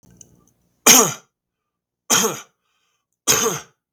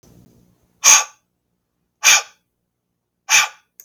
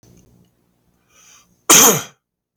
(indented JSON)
{
  "three_cough_length": "3.9 s",
  "three_cough_amplitude": 32768,
  "three_cough_signal_mean_std_ratio": 0.33,
  "exhalation_length": "3.8 s",
  "exhalation_amplitude": 32768,
  "exhalation_signal_mean_std_ratio": 0.3,
  "cough_length": "2.6 s",
  "cough_amplitude": 32768,
  "cough_signal_mean_std_ratio": 0.29,
  "survey_phase": "beta (2021-08-13 to 2022-03-07)",
  "age": "18-44",
  "gender": "Male",
  "wearing_mask": "No",
  "symptom_cough_any": true,
  "symptom_fatigue": true,
  "symptom_headache": true,
  "symptom_other": true,
  "symptom_onset": "3 days",
  "smoker_status": "Never smoked",
  "respiratory_condition_asthma": false,
  "respiratory_condition_other": false,
  "recruitment_source": "Test and Trace",
  "submission_delay": "2 days",
  "covid_test_result": "Positive",
  "covid_test_method": "RT-qPCR",
  "covid_ct_value": 17.5,
  "covid_ct_gene": "N gene",
  "covid_ct_mean": 18.4,
  "covid_viral_load": "900000 copies/ml",
  "covid_viral_load_category": "Low viral load (10K-1M copies/ml)"
}